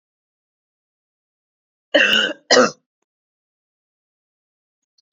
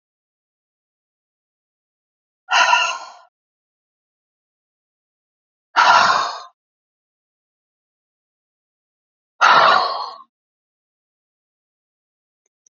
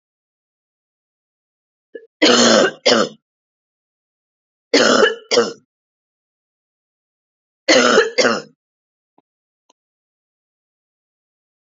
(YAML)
cough_length: 5.1 s
cough_amplitude: 30479
cough_signal_mean_std_ratio: 0.25
exhalation_length: 12.7 s
exhalation_amplitude: 29123
exhalation_signal_mean_std_ratio: 0.28
three_cough_length: 11.8 s
three_cough_amplitude: 32767
three_cough_signal_mean_std_ratio: 0.32
survey_phase: beta (2021-08-13 to 2022-03-07)
age: 18-44
gender: Female
wearing_mask: 'No'
symptom_cough_any: true
symptom_new_continuous_cough: true
symptom_runny_or_blocked_nose: true
symptom_sore_throat: true
symptom_headache: true
smoker_status: Never smoked
respiratory_condition_asthma: false
respiratory_condition_other: false
recruitment_source: Test and Trace
submission_delay: 2 days
covid_test_result: Positive
covid_test_method: ePCR